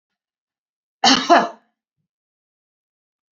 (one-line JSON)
{"three_cough_length": "3.3 s", "three_cough_amplitude": 32767, "three_cough_signal_mean_std_ratio": 0.26, "survey_phase": "beta (2021-08-13 to 2022-03-07)", "age": "65+", "gender": "Female", "wearing_mask": "No", "symptom_none": true, "smoker_status": "Never smoked", "respiratory_condition_asthma": false, "respiratory_condition_other": false, "recruitment_source": "REACT", "submission_delay": "1 day", "covid_test_result": "Negative", "covid_test_method": "RT-qPCR"}